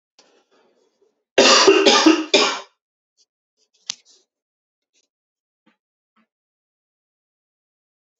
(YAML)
three_cough_length: 8.2 s
three_cough_amplitude: 31645
three_cough_signal_mean_std_ratio: 0.28
survey_phase: beta (2021-08-13 to 2022-03-07)
age: 18-44
gender: Male
wearing_mask: 'No'
symptom_none: true
smoker_status: Ex-smoker
respiratory_condition_asthma: false
respiratory_condition_other: false
recruitment_source: Test and Trace
submission_delay: 2 days
covid_test_result: Positive
covid_test_method: RT-qPCR
covid_ct_value: 25.2
covid_ct_gene: ORF1ab gene
covid_ct_mean: 25.5
covid_viral_load: 4200 copies/ml
covid_viral_load_category: Minimal viral load (< 10K copies/ml)